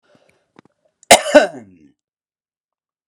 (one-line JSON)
{"cough_length": "3.1 s", "cough_amplitude": 32768, "cough_signal_mean_std_ratio": 0.22, "survey_phase": "alpha (2021-03-01 to 2021-08-12)", "age": "45-64", "gender": "Male", "wearing_mask": "No", "symptom_none": true, "smoker_status": "Never smoked", "respiratory_condition_asthma": false, "respiratory_condition_other": false, "recruitment_source": "REACT", "submission_delay": "3 days", "covid_test_result": "Negative", "covid_test_method": "RT-qPCR"}